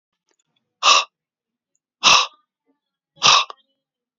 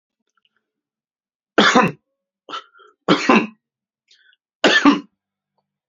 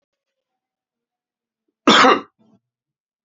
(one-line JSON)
{"exhalation_length": "4.2 s", "exhalation_amplitude": 32768, "exhalation_signal_mean_std_ratio": 0.31, "three_cough_length": "5.9 s", "three_cough_amplitude": 32767, "three_cough_signal_mean_std_ratio": 0.33, "cough_length": "3.2 s", "cough_amplitude": 29898, "cough_signal_mean_std_ratio": 0.25, "survey_phase": "beta (2021-08-13 to 2022-03-07)", "age": "45-64", "gender": "Male", "wearing_mask": "No", "symptom_none": true, "smoker_status": "Never smoked", "respiratory_condition_asthma": false, "respiratory_condition_other": false, "recruitment_source": "REACT", "submission_delay": "1 day", "covid_test_result": "Negative", "covid_test_method": "RT-qPCR", "influenza_a_test_result": "Negative", "influenza_b_test_result": "Negative"}